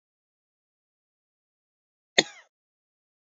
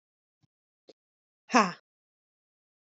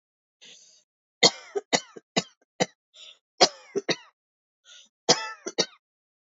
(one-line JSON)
{"cough_length": "3.2 s", "cough_amplitude": 29229, "cough_signal_mean_std_ratio": 0.08, "exhalation_length": "2.9 s", "exhalation_amplitude": 16980, "exhalation_signal_mean_std_ratio": 0.16, "three_cough_length": "6.4 s", "three_cough_amplitude": 22493, "three_cough_signal_mean_std_ratio": 0.24, "survey_phase": "alpha (2021-03-01 to 2021-08-12)", "age": "18-44", "gender": "Female", "wearing_mask": "No", "symptom_none": true, "smoker_status": "Never smoked", "respiratory_condition_asthma": false, "respiratory_condition_other": false, "recruitment_source": "REACT", "submission_delay": "1 day", "covid_test_result": "Negative", "covid_test_method": "RT-qPCR"}